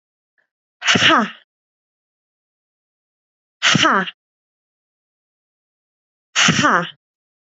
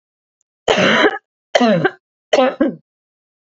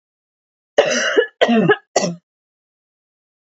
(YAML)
exhalation_length: 7.6 s
exhalation_amplitude: 31158
exhalation_signal_mean_std_ratio: 0.33
three_cough_length: 3.5 s
three_cough_amplitude: 31110
three_cough_signal_mean_std_ratio: 0.47
cough_length: 3.5 s
cough_amplitude: 27963
cough_signal_mean_std_ratio: 0.41
survey_phase: beta (2021-08-13 to 2022-03-07)
age: 18-44
gender: Female
wearing_mask: 'No'
symptom_runny_or_blocked_nose: true
symptom_abdominal_pain: true
smoker_status: Never smoked
respiratory_condition_asthma: false
respiratory_condition_other: false
recruitment_source: REACT
submission_delay: 2 days
covid_test_result: Negative
covid_test_method: RT-qPCR
influenza_a_test_result: Negative
influenza_b_test_result: Negative